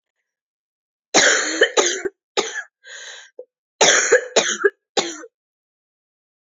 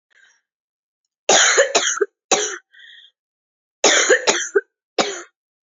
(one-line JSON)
{"three_cough_length": "6.5 s", "three_cough_amplitude": 30028, "three_cough_signal_mean_std_ratio": 0.41, "cough_length": "5.6 s", "cough_amplitude": 31954, "cough_signal_mean_std_ratio": 0.43, "survey_phase": "alpha (2021-03-01 to 2021-08-12)", "age": "18-44", "gender": "Female", "wearing_mask": "No", "symptom_cough_any": true, "symptom_new_continuous_cough": true, "symptom_shortness_of_breath": true, "symptom_fatigue": true, "symptom_change_to_sense_of_smell_or_taste": true, "smoker_status": "Ex-smoker", "respiratory_condition_asthma": true, "respiratory_condition_other": false, "recruitment_source": "Test and Trace", "submission_delay": "3 days", "covid_test_result": "Positive", "covid_test_method": "RT-qPCR", "covid_ct_value": 20.8, "covid_ct_gene": "ORF1ab gene", "covid_ct_mean": 21.2, "covid_viral_load": "110000 copies/ml", "covid_viral_load_category": "Low viral load (10K-1M copies/ml)"}